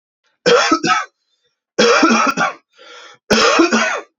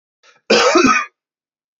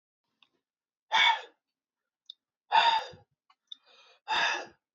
{"three_cough_length": "4.2 s", "three_cough_amplitude": 32768, "three_cough_signal_mean_std_ratio": 0.61, "cough_length": "1.8 s", "cough_amplitude": 28715, "cough_signal_mean_std_ratio": 0.48, "exhalation_length": "4.9 s", "exhalation_amplitude": 10115, "exhalation_signal_mean_std_ratio": 0.35, "survey_phase": "beta (2021-08-13 to 2022-03-07)", "age": "18-44", "gender": "Male", "wearing_mask": "No", "symptom_none": true, "smoker_status": "Ex-smoker", "respiratory_condition_asthma": false, "respiratory_condition_other": false, "recruitment_source": "REACT", "submission_delay": "1 day", "covid_test_result": "Negative", "covid_test_method": "RT-qPCR", "influenza_a_test_result": "Negative", "influenza_b_test_result": "Negative"}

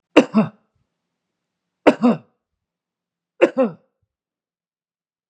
{"three_cough_length": "5.3 s", "three_cough_amplitude": 32768, "three_cough_signal_mean_std_ratio": 0.25, "survey_phase": "beta (2021-08-13 to 2022-03-07)", "age": "65+", "gender": "Male", "wearing_mask": "No", "symptom_runny_or_blocked_nose": true, "smoker_status": "Never smoked", "respiratory_condition_asthma": false, "respiratory_condition_other": false, "recruitment_source": "REACT", "submission_delay": "1 day", "covid_test_result": "Negative", "covid_test_method": "RT-qPCR", "influenza_a_test_result": "Negative", "influenza_b_test_result": "Negative"}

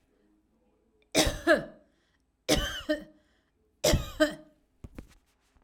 {"three_cough_length": "5.6 s", "three_cough_amplitude": 12015, "three_cough_signal_mean_std_ratio": 0.35, "survey_phase": "alpha (2021-03-01 to 2021-08-12)", "age": "45-64", "gender": "Female", "wearing_mask": "No", "symptom_none": true, "smoker_status": "Never smoked", "respiratory_condition_asthma": false, "respiratory_condition_other": false, "recruitment_source": "REACT", "submission_delay": "6 days", "covid_test_result": "Negative", "covid_test_method": "RT-qPCR"}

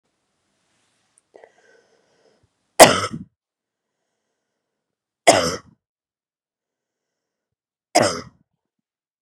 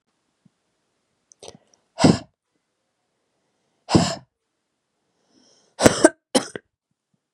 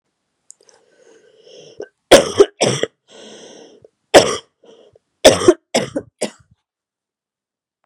{"three_cough_length": "9.2 s", "three_cough_amplitude": 32768, "three_cough_signal_mean_std_ratio": 0.18, "exhalation_length": "7.3 s", "exhalation_amplitude": 32768, "exhalation_signal_mean_std_ratio": 0.21, "cough_length": "7.9 s", "cough_amplitude": 32768, "cough_signal_mean_std_ratio": 0.27, "survey_phase": "beta (2021-08-13 to 2022-03-07)", "age": "18-44", "gender": "Female", "wearing_mask": "No", "symptom_cough_any": true, "symptom_sore_throat": true, "symptom_fatigue": true, "symptom_fever_high_temperature": true, "symptom_headache": true, "symptom_onset": "4 days", "smoker_status": "Never smoked", "respiratory_condition_asthma": false, "respiratory_condition_other": false, "recruitment_source": "Test and Trace", "submission_delay": "1 day", "covid_test_result": "Positive", "covid_test_method": "RT-qPCR", "covid_ct_value": 24.3, "covid_ct_gene": "ORF1ab gene"}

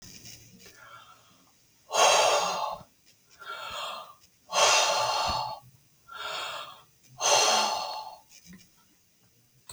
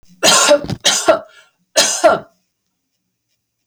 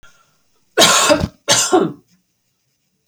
{"exhalation_length": "9.7 s", "exhalation_amplitude": 13820, "exhalation_signal_mean_std_ratio": 0.49, "three_cough_length": "3.7 s", "three_cough_amplitude": 32768, "three_cough_signal_mean_std_ratio": 0.45, "cough_length": "3.1 s", "cough_amplitude": 32768, "cough_signal_mean_std_ratio": 0.44, "survey_phase": "alpha (2021-03-01 to 2021-08-12)", "age": "45-64", "gender": "Female", "wearing_mask": "No", "symptom_none": true, "symptom_onset": "6 days", "smoker_status": "Ex-smoker", "respiratory_condition_asthma": false, "respiratory_condition_other": false, "recruitment_source": "REACT", "submission_delay": "2 days", "covid_test_result": "Negative", "covid_test_method": "RT-qPCR"}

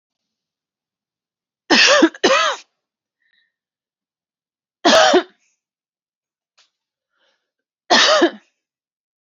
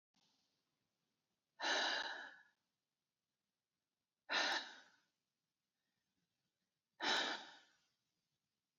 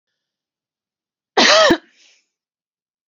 {"three_cough_length": "9.2 s", "three_cough_amplitude": 32433, "three_cough_signal_mean_std_ratio": 0.32, "exhalation_length": "8.8 s", "exhalation_amplitude": 1926, "exhalation_signal_mean_std_ratio": 0.33, "cough_length": "3.1 s", "cough_amplitude": 29833, "cough_signal_mean_std_ratio": 0.3, "survey_phase": "beta (2021-08-13 to 2022-03-07)", "age": "18-44", "gender": "Female", "wearing_mask": "No", "symptom_sore_throat": true, "symptom_onset": "12 days", "smoker_status": "Never smoked", "respiratory_condition_asthma": false, "respiratory_condition_other": false, "recruitment_source": "REACT", "submission_delay": "0 days", "covid_test_result": "Negative", "covid_test_method": "RT-qPCR", "influenza_a_test_result": "Negative", "influenza_b_test_result": "Negative"}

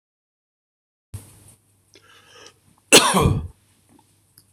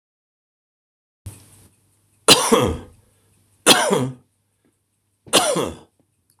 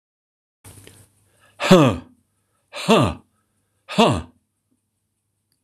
{"cough_length": "4.5 s", "cough_amplitude": 26028, "cough_signal_mean_std_ratio": 0.25, "three_cough_length": "6.4 s", "three_cough_amplitude": 26028, "three_cough_signal_mean_std_ratio": 0.33, "exhalation_length": "5.6 s", "exhalation_amplitude": 26028, "exhalation_signal_mean_std_ratio": 0.29, "survey_phase": "beta (2021-08-13 to 2022-03-07)", "age": "65+", "gender": "Male", "wearing_mask": "No", "symptom_cough_any": true, "symptom_runny_or_blocked_nose": true, "symptom_change_to_sense_of_smell_or_taste": true, "symptom_onset": "3 days", "smoker_status": "Ex-smoker", "respiratory_condition_asthma": true, "respiratory_condition_other": false, "recruitment_source": "Test and Trace", "submission_delay": "2 days", "covid_test_result": "Positive", "covid_test_method": "RT-qPCR", "covid_ct_value": 16.5, "covid_ct_gene": "ORF1ab gene", "covid_ct_mean": 17.6, "covid_viral_load": "1800000 copies/ml", "covid_viral_load_category": "High viral load (>1M copies/ml)"}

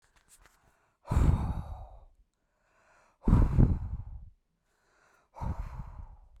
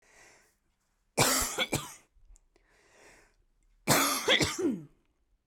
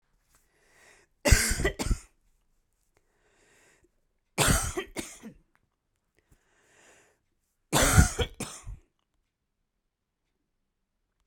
{"exhalation_length": "6.4 s", "exhalation_amplitude": 12520, "exhalation_signal_mean_std_ratio": 0.38, "cough_length": "5.5 s", "cough_amplitude": 10424, "cough_signal_mean_std_ratio": 0.42, "three_cough_length": "11.3 s", "three_cough_amplitude": 20625, "three_cough_signal_mean_std_ratio": 0.28, "survey_phase": "beta (2021-08-13 to 2022-03-07)", "age": "18-44", "gender": "Female", "wearing_mask": "No", "symptom_none": true, "smoker_status": "Current smoker (e-cigarettes or vapes only)", "respiratory_condition_asthma": true, "respiratory_condition_other": false, "recruitment_source": "REACT", "submission_delay": "5 days", "covid_test_result": "Negative", "covid_test_method": "RT-qPCR"}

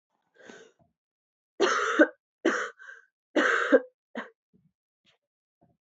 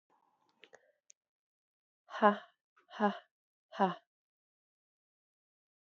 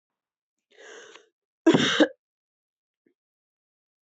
{"three_cough_length": "5.8 s", "three_cough_amplitude": 15548, "three_cough_signal_mean_std_ratio": 0.34, "exhalation_length": "5.8 s", "exhalation_amplitude": 8173, "exhalation_signal_mean_std_ratio": 0.2, "cough_length": "4.1 s", "cough_amplitude": 15137, "cough_signal_mean_std_ratio": 0.24, "survey_phase": "alpha (2021-03-01 to 2021-08-12)", "age": "18-44", "gender": "Female", "wearing_mask": "No", "symptom_cough_any": true, "symptom_shortness_of_breath": true, "symptom_diarrhoea": true, "symptom_fatigue": true, "symptom_change_to_sense_of_smell_or_taste": true, "symptom_loss_of_taste": true, "symptom_onset": "3 days", "smoker_status": "Never smoked", "respiratory_condition_asthma": false, "respiratory_condition_other": false, "recruitment_source": "Test and Trace", "submission_delay": "1 day", "covid_test_result": "Positive", "covid_test_method": "RT-qPCR", "covid_ct_value": 18.6, "covid_ct_gene": "ORF1ab gene", "covid_ct_mean": 19.3, "covid_viral_load": "480000 copies/ml", "covid_viral_load_category": "Low viral load (10K-1M copies/ml)"}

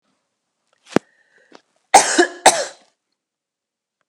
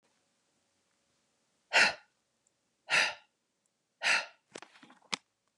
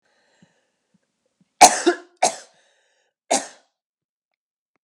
{"cough_length": "4.1 s", "cough_amplitude": 32768, "cough_signal_mean_std_ratio": 0.24, "exhalation_length": "5.6 s", "exhalation_amplitude": 8355, "exhalation_signal_mean_std_ratio": 0.27, "three_cough_length": "4.8 s", "three_cough_amplitude": 32768, "three_cough_signal_mean_std_ratio": 0.21, "survey_phase": "alpha (2021-03-01 to 2021-08-12)", "age": "45-64", "gender": "Female", "wearing_mask": "No", "symptom_none": true, "smoker_status": "Never smoked", "respiratory_condition_asthma": false, "respiratory_condition_other": false, "recruitment_source": "REACT", "submission_delay": "1 day", "covid_test_result": "Negative", "covid_test_method": "RT-qPCR"}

